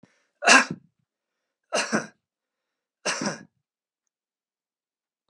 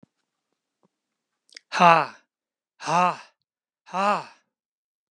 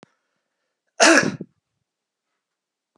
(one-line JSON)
{"three_cough_length": "5.3 s", "three_cough_amplitude": 25476, "three_cough_signal_mean_std_ratio": 0.25, "exhalation_length": "5.1 s", "exhalation_amplitude": 30448, "exhalation_signal_mean_std_ratio": 0.27, "cough_length": "3.0 s", "cough_amplitude": 32767, "cough_signal_mean_std_ratio": 0.25, "survey_phase": "beta (2021-08-13 to 2022-03-07)", "age": "65+", "gender": "Male", "wearing_mask": "No", "symptom_none": true, "smoker_status": "Never smoked", "respiratory_condition_asthma": false, "respiratory_condition_other": false, "recruitment_source": "REACT", "submission_delay": "0 days", "covid_test_result": "Negative", "covid_test_method": "RT-qPCR"}